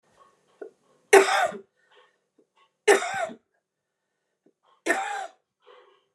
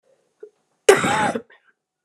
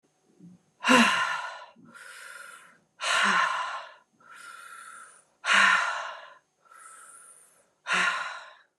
{"three_cough_length": "6.1 s", "three_cough_amplitude": 28517, "three_cough_signal_mean_std_ratio": 0.28, "cough_length": "2.0 s", "cough_amplitude": 29204, "cough_signal_mean_std_ratio": 0.34, "exhalation_length": "8.8 s", "exhalation_amplitude": 14783, "exhalation_signal_mean_std_ratio": 0.45, "survey_phase": "beta (2021-08-13 to 2022-03-07)", "age": "45-64", "gender": "Female", "wearing_mask": "No", "symptom_cough_any": true, "symptom_abdominal_pain": true, "symptom_diarrhoea": true, "symptom_headache": true, "symptom_onset": "4 days", "smoker_status": "Never smoked", "respiratory_condition_asthma": false, "respiratory_condition_other": false, "recruitment_source": "Test and Trace", "submission_delay": "2 days", "covid_test_result": "Positive", "covid_test_method": "RT-qPCR", "covid_ct_value": 15.9, "covid_ct_gene": "ORF1ab gene", "covid_ct_mean": 16.4, "covid_viral_load": "4200000 copies/ml", "covid_viral_load_category": "High viral load (>1M copies/ml)"}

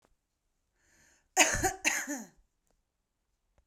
{"cough_length": "3.7 s", "cough_amplitude": 15157, "cough_signal_mean_std_ratio": 0.31, "survey_phase": "beta (2021-08-13 to 2022-03-07)", "age": "45-64", "gender": "Female", "wearing_mask": "No", "symptom_none": true, "smoker_status": "Current smoker (11 or more cigarettes per day)", "respiratory_condition_asthma": true, "respiratory_condition_other": false, "recruitment_source": "Test and Trace", "submission_delay": "2 days", "covid_test_result": "Negative", "covid_test_method": "ePCR"}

